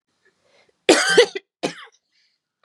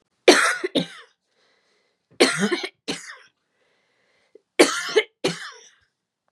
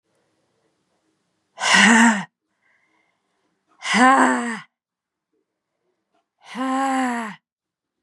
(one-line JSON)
{"cough_length": "2.6 s", "cough_amplitude": 32269, "cough_signal_mean_std_ratio": 0.31, "three_cough_length": "6.3 s", "three_cough_amplitude": 32318, "three_cough_signal_mean_std_ratio": 0.33, "exhalation_length": "8.0 s", "exhalation_amplitude": 32506, "exhalation_signal_mean_std_ratio": 0.37, "survey_phase": "beta (2021-08-13 to 2022-03-07)", "age": "18-44", "gender": "Female", "wearing_mask": "Yes", "symptom_cough_any": true, "symptom_runny_or_blocked_nose": true, "symptom_fatigue": true, "symptom_other": true, "smoker_status": "Ex-smoker", "respiratory_condition_asthma": false, "respiratory_condition_other": false, "recruitment_source": "Test and Trace", "submission_delay": "1 day", "covid_test_result": "Positive", "covid_test_method": "RT-qPCR", "covid_ct_value": 26.1, "covid_ct_gene": "N gene"}